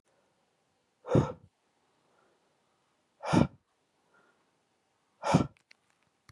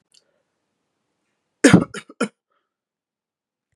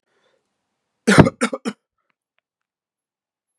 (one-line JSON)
{"exhalation_length": "6.3 s", "exhalation_amplitude": 12348, "exhalation_signal_mean_std_ratio": 0.23, "three_cough_length": "3.8 s", "three_cough_amplitude": 32768, "three_cough_signal_mean_std_ratio": 0.18, "cough_length": "3.6 s", "cough_amplitude": 32768, "cough_signal_mean_std_ratio": 0.21, "survey_phase": "beta (2021-08-13 to 2022-03-07)", "age": "18-44", "gender": "Male", "wearing_mask": "No", "symptom_none": true, "smoker_status": "Never smoked", "respiratory_condition_asthma": false, "respiratory_condition_other": false, "recruitment_source": "REACT", "submission_delay": "1 day", "covid_test_result": "Negative", "covid_test_method": "RT-qPCR"}